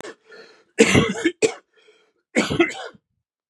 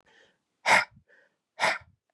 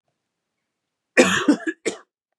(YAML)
three_cough_length: 3.5 s
three_cough_amplitude: 32276
three_cough_signal_mean_std_ratio: 0.39
exhalation_length: 2.1 s
exhalation_amplitude: 12715
exhalation_signal_mean_std_ratio: 0.31
cough_length: 2.4 s
cough_amplitude: 31234
cough_signal_mean_std_ratio: 0.33
survey_phase: beta (2021-08-13 to 2022-03-07)
age: 45-64
gender: Male
wearing_mask: 'No'
symptom_cough_any: true
symptom_new_continuous_cough: true
symptom_runny_or_blocked_nose: true
symptom_shortness_of_breath: true
symptom_sore_throat: true
symptom_fatigue: true
symptom_headache: true
symptom_other: true
smoker_status: Ex-smoker
respiratory_condition_asthma: false
respiratory_condition_other: false
recruitment_source: Test and Trace
submission_delay: 47 days
covid_test_result: Negative
covid_test_method: ePCR